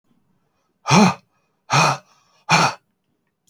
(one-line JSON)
{"exhalation_length": "3.5 s", "exhalation_amplitude": 28476, "exhalation_signal_mean_std_ratio": 0.37, "survey_phase": "alpha (2021-03-01 to 2021-08-12)", "age": "45-64", "gender": "Male", "wearing_mask": "No", "symptom_none": true, "smoker_status": "Never smoked", "respiratory_condition_asthma": false, "respiratory_condition_other": false, "recruitment_source": "REACT", "submission_delay": "1 day", "covid_test_result": "Negative", "covid_test_method": "RT-qPCR"}